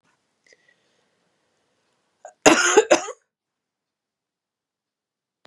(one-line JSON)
{"cough_length": "5.5 s", "cough_amplitude": 32767, "cough_signal_mean_std_ratio": 0.22, "survey_phase": "beta (2021-08-13 to 2022-03-07)", "age": "45-64", "gender": "Female", "wearing_mask": "No", "symptom_cough_any": true, "symptom_runny_or_blocked_nose": true, "symptom_fatigue": true, "smoker_status": "Ex-smoker", "respiratory_condition_asthma": true, "respiratory_condition_other": false, "recruitment_source": "Test and Trace", "submission_delay": "-1 day", "covid_test_result": "Positive", "covid_test_method": "LFT"}